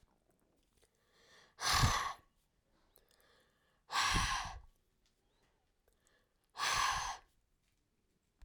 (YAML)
exhalation_length: 8.4 s
exhalation_amplitude: 4915
exhalation_signal_mean_std_ratio: 0.37
survey_phase: alpha (2021-03-01 to 2021-08-12)
age: 65+
gender: Female
wearing_mask: 'No'
symptom_none: true
smoker_status: Never smoked
respiratory_condition_asthma: false
respiratory_condition_other: false
recruitment_source: REACT
submission_delay: 1 day
covid_test_result: Negative
covid_test_method: RT-qPCR